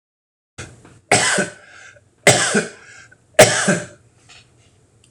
three_cough_length: 5.1 s
three_cough_amplitude: 26028
three_cough_signal_mean_std_ratio: 0.37
survey_phase: alpha (2021-03-01 to 2021-08-12)
age: 45-64
gender: Male
wearing_mask: 'No'
symptom_none: true
smoker_status: Current smoker (1 to 10 cigarettes per day)
respiratory_condition_asthma: false
respiratory_condition_other: false
recruitment_source: REACT
submission_delay: 2 days
covid_test_result: Negative
covid_test_method: RT-qPCR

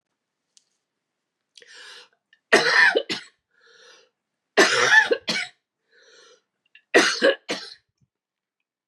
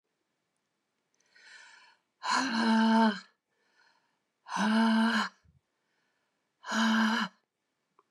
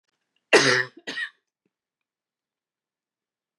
three_cough_length: 8.9 s
three_cough_amplitude: 27864
three_cough_signal_mean_std_ratio: 0.34
exhalation_length: 8.1 s
exhalation_amplitude: 6460
exhalation_signal_mean_std_ratio: 0.46
cough_length: 3.6 s
cough_amplitude: 23498
cough_signal_mean_std_ratio: 0.25
survey_phase: beta (2021-08-13 to 2022-03-07)
age: 65+
gender: Female
wearing_mask: 'No'
symptom_cough_any: true
symptom_runny_or_blocked_nose: true
symptom_shortness_of_breath: true
symptom_sore_throat: true
symptom_diarrhoea: true
symptom_fatigue: true
symptom_headache: true
smoker_status: Never smoked
respiratory_condition_asthma: true
respiratory_condition_other: false
recruitment_source: Test and Trace
submission_delay: 2 days
covid_test_result: Positive
covid_test_method: LFT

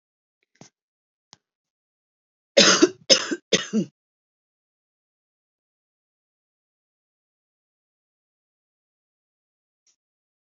cough_length: 10.6 s
cough_amplitude: 30540
cough_signal_mean_std_ratio: 0.18
survey_phase: beta (2021-08-13 to 2022-03-07)
age: 45-64
gender: Female
wearing_mask: 'No'
symptom_none: true
smoker_status: Never smoked
respiratory_condition_asthma: true
respiratory_condition_other: false
recruitment_source: REACT
submission_delay: 3 days
covid_test_result: Negative
covid_test_method: RT-qPCR
influenza_a_test_result: Unknown/Void
influenza_b_test_result: Unknown/Void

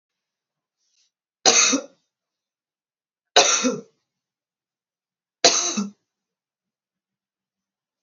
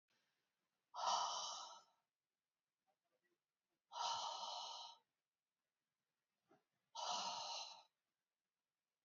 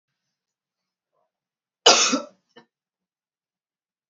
three_cough_length: 8.0 s
three_cough_amplitude: 32768
three_cough_signal_mean_std_ratio: 0.28
exhalation_length: 9.0 s
exhalation_amplitude: 1540
exhalation_signal_mean_std_ratio: 0.42
cough_length: 4.1 s
cough_amplitude: 32260
cough_signal_mean_std_ratio: 0.21
survey_phase: beta (2021-08-13 to 2022-03-07)
age: 45-64
gender: Female
wearing_mask: 'No'
symptom_cough_any: true
symptom_runny_or_blocked_nose: true
symptom_sore_throat: true
symptom_headache: true
symptom_other: true
smoker_status: Never smoked
respiratory_condition_asthma: false
respiratory_condition_other: false
recruitment_source: Test and Trace
submission_delay: 3 days
covid_test_result: Negative
covid_test_method: RT-qPCR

